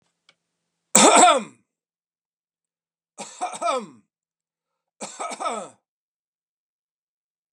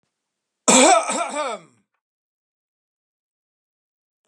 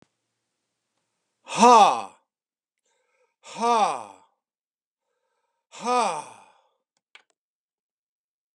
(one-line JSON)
{"three_cough_length": "7.5 s", "three_cough_amplitude": 32768, "three_cough_signal_mean_std_ratio": 0.27, "cough_length": "4.3 s", "cough_amplitude": 32685, "cough_signal_mean_std_ratio": 0.3, "exhalation_length": "8.5 s", "exhalation_amplitude": 24356, "exhalation_signal_mean_std_ratio": 0.26, "survey_phase": "beta (2021-08-13 to 2022-03-07)", "age": "45-64", "gender": "Male", "wearing_mask": "No", "symptom_none": true, "smoker_status": "Ex-smoker", "respiratory_condition_asthma": false, "respiratory_condition_other": false, "recruitment_source": "REACT", "submission_delay": "2 days", "covid_test_result": "Negative", "covid_test_method": "RT-qPCR", "influenza_a_test_result": "Negative", "influenza_b_test_result": "Negative"}